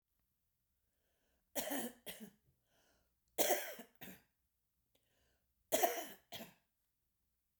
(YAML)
three_cough_length: 7.6 s
three_cough_amplitude: 4282
three_cough_signal_mean_std_ratio: 0.29
survey_phase: beta (2021-08-13 to 2022-03-07)
age: 65+
gender: Female
wearing_mask: 'No'
symptom_cough_any: true
smoker_status: Ex-smoker
respiratory_condition_asthma: false
respiratory_condition_other: false
recruitment_source: REACT
submission_delay: 0 days
covid_test_result: Negative
covid_test_method: RT-qPCR
influenza_a_test_result: Unknown/Void
influenza_b_test_result: Unknown/Void